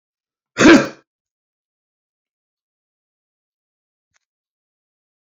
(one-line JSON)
{"cough_length": "5.2 s", "cough_amplitude": 29067, "cough_signal_mean_std_ratio": 0.18, "survey_phase": "beta (2021-08-13 to 2022-03-07)", "age": "65+", "gender": "Male", "wearing_mask": "No", "symptom_cough_any": true, "symptom_shortness_of_breath": true, "symptom_sore_throat": true, "symptom_abdominal_pain": true, "symptom_fatigue": true, "symptom_fever_high_temperature": true, "symptom_headache": true, "symptom_loss_of_taste": true, "symptom_onset": "8 days", "smoker_status": "Never smoked", "respiratory_condition_asthma": false, "respiratory_condition_other": false, "recruitment_source": "Test and Trace", "submission_delay": "2 days", "covid_test_result": "Positive", "covid_test_method": "RT-qPCR", "covid_ct_value": 23.4, "covid_ct_gene": "ORF1ab gene", "covid_ct_mean": 24.0, "covid_viral_load": "14000 copies/ml", "covid_viral_load_category": "Low viral load (10K-1M copies/ml)"}